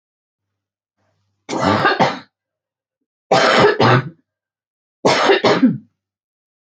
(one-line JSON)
{"three_cough_length": "6.7 s", "three_cough_amplitude": 29678, "three_cough_signal_mean_std_ratio": 0.45, "survey_phase": "beta (2021-08-13 to 2022-03-07)", "age": "45-64", "gender": "Female", "wearing_mask": "No", "symptom_cough_any": true, "symptom_headache": true, "symptom_change_to_sense_of_smell_or_taste": true, "symptom_loss_of_taste": true, "smoker_status": "Ex-smoker", "respiratory_condition_asthma": false, "respiratory_condition_other": false, "recruitment_source": "REACT", "submission_delay": "9 days", "covid_test_result": "Negative", "covid_test_method": "RT-qPCR"}